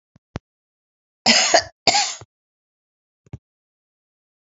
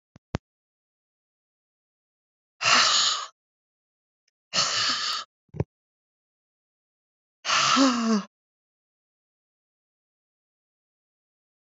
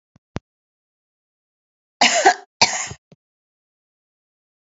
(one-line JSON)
{"cough_length": "4.5 s", "cough_amplitude": 32767, "cough_signal_mean_std_ratio": 0.28, "exhalation_length": "11.7 s", "exhalation_amplitude": 15349, "exhalation_signal_mean_std_ratio": 0.33, "three_cough_length": "4.7 s", "three_cough_amplitude": 32768, "three_cough_signal_mean_std_ratio": 0.24, "survey_phase": "beta (2021-08-13 to 2022-03-07)", "age": "65+", "gender": "Female", "wearing_mask": "No", "symptom_runny_or_blocked_nose": true, "symptom_sore_throat": true, "symptom_fatigue": true, "symptom_change_to_sense_of_smell_or_taste": true, "symptom_loss_of_taste": true, "symptom_onset": "3 days", "smoker_status": "Never smoked", "respiratory_condition_asthma": false, "respiratory_condition_other": false, "recruitment_source": "Test and Trace", "submission_delay": "1 day", "covid_test_result": "Positive", "covid_test_method": "ePCR"}